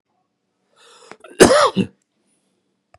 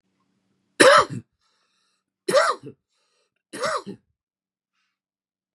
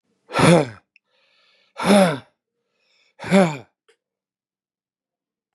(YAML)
cough_length: 3.0 s
cough_amplitude: 32768
cough_signal_mean_std_ratio: 0.28
three_cough_length: 5.5 s
three_cough_amplitude: 32429
three_cough_signal_mean_std_ratio: 0.27
exhalation_length: 5.5 s
exhalation_amplitude: 26765
exhalation_signal_mean_std_ratio: 0.32
survey_phase: beta (2021-08-13 to 2022-03-07)
age: 65+
gender: Male
wearing_mask: 'No'
symptom_none: true
smoker_status: Never smoked
respiratory_condition_asthma: true
respiratory_condition_other: false
recruitment_source: REACT
submission_delay: 3 days
covid_test_result: Negative
covid_test_method: RT-qPCR
influenza_a_test_result: Negative
influenza_b_test_result: Negative